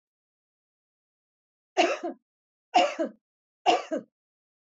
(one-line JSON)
{"three_cough_length": "4.8 s", "three_cough_amplitude": 10728, "three_cough_signal_mean_std_ratio": 0.31, "survey_phase": "alpha (2021-03-01 to 2021-08-12)", "age": "65+", "gender": "Female", "wearing_mask": "No", "symptom_cough_any": true, "symptom_onset": "12 days", "smoker_status": "Never smoked", "respiratory_condition_asthma": false, "respiratory_condition_other": false, "recruitment_source": "REACT", "submission_delay": "3 days", "covid_test_result": "Negative", "covid_test_method": "RT-qPCR"}